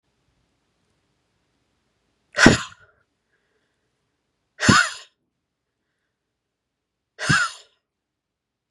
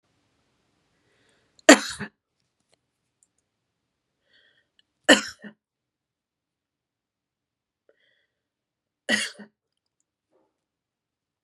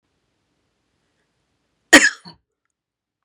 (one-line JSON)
{"exhalation_length": "8.7 s", "exhalation_amplitude": 32768, "exhalation_signal_mean_std_ratio": 0.21, "three_cough_length": "11.4 s", "three_cough_amplitude": 32768, "three_cough_signal_mean_std_ratio": 0.13, "cough_length": "3.2 s", "cough_amplitude": 32768, "cough_signal_mean_std_ratio": 0.17, "survey_phase": "beta (2021-08-13 to 2022-03-07)", "age": "45-64", "gender": "Female", "wearing_mask": "Yes", "symptom_none": true, "smoker_status": "Ex-smoker", "respiratory_condition_asthma": false, "respiratory_condition_other": false, "recruitment_source": "Test and Trace", "submission_delay": "3 days", "covid_test_result": "Negative", "covid_test_method": "ePCR"}